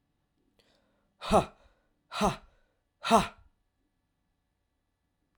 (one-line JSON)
{"exhalation_length": "5.4 s", "exhalation_amplitude": 12179, "exhalation_signal_mean_std_ratio": 0.24, "survey_phase": "alpha (2021-03-01 to 2021-08-12)", "age": "18-44", "gender": "Male", "wearing_mask": "No", "symptom_cough_any": true, "symptom_new_continuous_cough": true, "symptom_abdominal_pain": true, "symptom_diarrhoea": true, "symptom_fatigue": true, "symptom_fever_high_temperature": true, "symptom_headache": true, "symptom_change_to_sense_of_smell_or_taste": true, "symptom_loss_of_taste": true, "smoker_status": "Never smoked", "respiratory_condition_asthma": false, "respiratory_condition_other": false, "recruitment_source": "Test and Trace", "submission_delay": "2 days", "covid_test_result": "Positive", "covid_test_method": "RT-qPCR"}